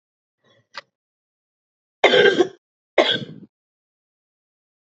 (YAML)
cough_length: 4.9 s
cough_amplitude: 28116
cough_signal_mean_std_ratio: 0.28
survey_phase: beta (2021-08-13 to 2022-03-07)
age: 18-44
gender: Female
wearing_mask: 'No'
symptom_cough_any: true
symptom_runny_or_blocked_nose: true
symptom_sore_throat: true
symptom_fatigue: true
symptom_fever_high_temperature: true
symptom_change_to_sense_of_smell_or_taste: true
symptom_loss_of_taste: true
symptom_onset: 4 days
smoker_status: Never smoked
respiratory_condition_asthma: false
respiratory_condition_other: false
recruitment_source: Test and Trace
submission_delay: 3 days
covid_test_result: Positive
covid_test_method: ePCR